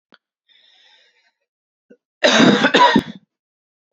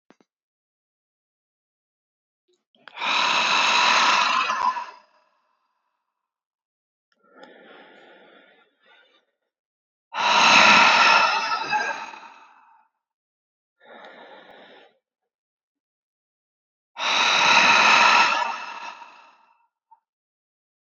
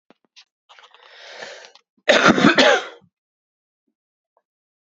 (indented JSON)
{
  "three_cough_length": "3.9 s",
  "three_cough_amplitude": 31160,
  "three_cough_signal_mean_std_ratio": 0.36,
  "exhalation_length": "20.8 s",
  "exhalation_amplitude": 26412,
  "exhalation_signal_mean_std_ratio": 0.41,
  "cough_length": "4.9 s",
  "cough_amplitude": 31901,
  "cough_signal_mean_std_ratio": 0.31,
  "survey_phase": "beta (2021-08-13 to 2022-03-07)",
  "age": "18-44",
  "gender": "Female",
  "wearing_mask": "No",
  "symptom_cough_any": true,
  "symptom_fatigue": true,
  "symptom_headache": true,
  "symptom_onset": "4 days",
  "smoker_status": "Ex-smoker",
  "respiratory_condition_asthma": false,
  "respiratory_condition_other": false,
  "recruitment_source": "Test and Trace",
  "submission_delay": "2 days",
  "covid_test_result": "Positive",
  "covid_test_method": "RT-qPCR",
  "covid_ct_value": 19.0,
  "covid_ct_gene": "ORF1ab gene"
}